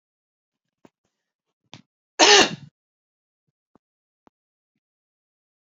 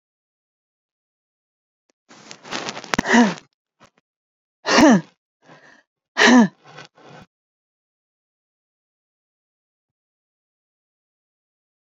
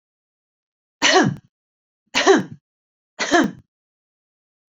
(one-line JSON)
{"cough_length": "5.7 s", "cough_amplitude": 31710, "cough_signal_mean_std_ratio": 0.18, "exhalation_length": "11.9 s", "exhalation_amplitude": 32768, "exhalation_signal_mean_std_ratio": 0.24, "three_cough_length": "4.8 s", "three_cough_amplitude": 27259, "three_cough_signal_mean_std_ratio": 0.33, "survey_phase": "beta (2021-08-13 to 2022-03-07)", "age": "18-44", "gender": "Female", "wearing_mask": "No", "symptom_runny_or_blocked_nose": true, "symptom_sore_throat": true, "symptom_fatigue": true, "symptom_headache": true, "symptom_change_to_sense_of_smell_or_taste": true, "smoker_status": "Never smoked", "respiratory_condition_asthma": false, "respiratory_condition_other": false, "recruitment_source": "REACT", "submission_delay": "1 day", "covid_test_result": "Negative", "covid_test_method": "RT-qPCR", "influenza_a_test_result": "Unknown/Void", "influenza_b_test_result": "Unknown/Void"}